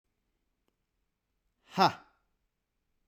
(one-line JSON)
{"exhalation_length": "3.1 s", "exhalation_amplitude": 9809, "exhalation_signal_mean_std_ratio": 0.17, "survey_phase": "beta (2021-08-13 to 2022-03-07)", "age": "18-44", "gender": "Male", "wearing_mask": "No", "symptom_none": true, "symptom_onset": "7 days", "smoker_status": "Never smoked", "respiratory_condition_asthma": false, "respiratory_condition_other": false, "recruitment_source": "REACT", "submission_delay": "1 day", "covid_test_result": "Negative", "covid_test_method": "RT-qPCR"}